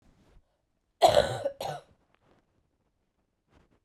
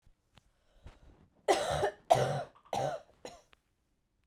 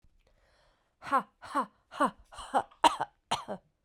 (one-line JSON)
{"cough_length": "3.8 s", "cough_amplitude": 15070, "cough_signal_mean_std_ratio": 0.25, "three_cough_length": "4.3 s", "three_cough_amplitude": 10079, "three_cough_signal_mean_std_ratio": 0.37, "exhalation_length": "3.8 s", "exhalation_amplitude": 13527, "exhalation_signal_mean_std_ratio": 0.34, "survey_phase": "beta (2021-08-13 to 2022-03-07)", "age": "18-44", "gender": "Female", "wearing_mask": "No", "symptom_cough_any": true, "symptom_runny_or_blocked_nose": true, "symptom_shortness_of_breath": true, "symptom_fatigue": true, "symptom_change_to_sense_of_smell_or_taste": true, "smoker_status": "Never smoked", "respiratory_condition_asthma": false, "respiratory_condition_other": false, "recruitment_source": "Test and Trace", "submission_delay": "2 days", "covid_test_result": "Positive", "covid_test_method": "RT-qPCR"}